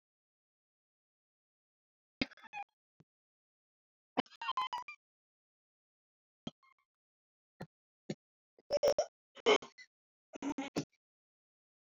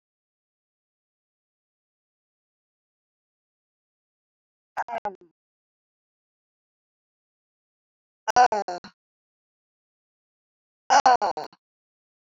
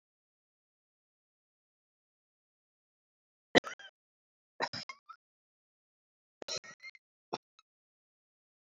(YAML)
three_cough_length: 11.9 s
three_cough_amplitude: 5472
three_cough_signal_mean_std_ratio: 0.22
exhalation_length: 12.3 s
exhalation_amplitude: 17434
exhalation_signal_mean_std_ratio: 0.18
cough_length: 8.8 s
cough_amplitude: 14193
cough_signal_mean_std_ratio: 0.12
survey_phase: beta (2021-08-13 to 2022-03-07)
age: 45-64
gender: Female
wearing_mask: 'No'
symptom_cough_any: true
symptom_runny_or_blocked_nose: true
symptom_shortness_of_breath: true
symptom_sore_throat: true
symptom_abdominal_pain: true
symptom_diarrhoea: true
symptom_fatigue: true
symptom_headache: true
symptom_change_to_sense_of_smell_or_taste: true
symptom_loss_of_taste: true
smoker_status: Current smoker (11 or more cigarettes per day)
respiratory_condition_asthma: false
respiratory_condition_other: false
recruitment_source: Test and Trace
submission_delay: 1 day
covid_test_result: Positive
covid_test_method: LFT